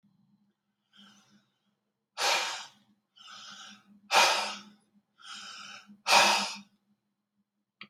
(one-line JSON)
{"exhalation_length": "7.9 s", "exhalation_amplitude": 13095, "exhalation_signal_mean_std_ratio": 0.33, "survey_phase": "beta (2021-08-13 to 2022-03-07)", "age": "65+", "gender": "Male", "wearing_mask": "No", "symptom_none": true, "smoker_status": "Ex-smoker", "respiratory_condition_asthma": false, "respiratory_condition_other": false, "recruitment_source": "REACT", "submission_delay": "3 days", "covid_test_result": "Negative", "covid_test_method": "RT-qPCR", "influenza_a_test_result": "Negative", "influenza_b_test_result": "Negative"}